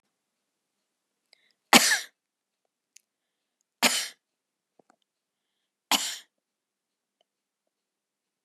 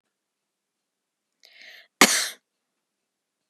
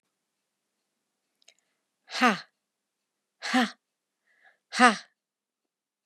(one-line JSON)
{"three_cough_length": "8.4 s", "three_cough_amplitude": 31977, "three_cough_signal_mean_std_ratio": 0.19, "cough_length": "3.5 s", "cough_amplitude": 32767, "cough_signal_mean_std_ratio": 0.18, "exhalation_length": "6.1 s", "exhalation_amplitude": 26017, "exhalation_signal_mean_std_ratio": 0.21, "survey_phase": "beta (2021-08-13 to 2022-03-07)", "age": "45-64", "gender": "Female", "wearing_mask": "No", "symptom_none": true, "smoker_status": "Never smoked", "respiratory_condition_asthma": false, "respiratory_condition_other": false, "recruitment_source": "REACT", "submission_delay": "2 days", "covid_test_result": "Negative", "covid_test_method": "RT-qPCR", "influenza_a_test_result": "Negative", "influenza_b_test_result": "Negative"}